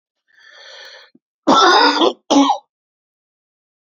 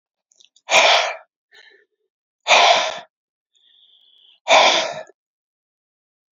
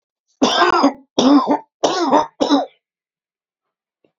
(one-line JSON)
{"cough_length": "3.9 s", "cough_amplitude": 29164, "cough_signal_mean_std_ratio": 0.41, "exhalation_length": "6.3 s", "exhalation_amplitude": 32383, "exhalation_signal_mean_std_ratio": 0.37, "three_cough_length": "4.2 s", "three_cough_amplitude": 32768, "three_cough_signal_mean_std_ratio": 0.5, "survey_phase": "beta (2021-08-13 to 2022-03-07)", "age": "45-64", "gender": "Male", "wearing_mask": "No", "symptom_cough_any": true, "symptom_shortness_of_breath": true, "symptom_fatigue": true, "smoker_status": "Ex-smoker", "respiratory_condition_asthma": false, "respiratory_condition_other": false, "recruitment_source": "REACT", "submission_delay": "2 days", "covid_test_result": "Negative", "covid_test_method": "RT-qPCR", "influenza_a_test_result": "Unknown/Void", "influenza_b_test_result": "Unknown/Void"}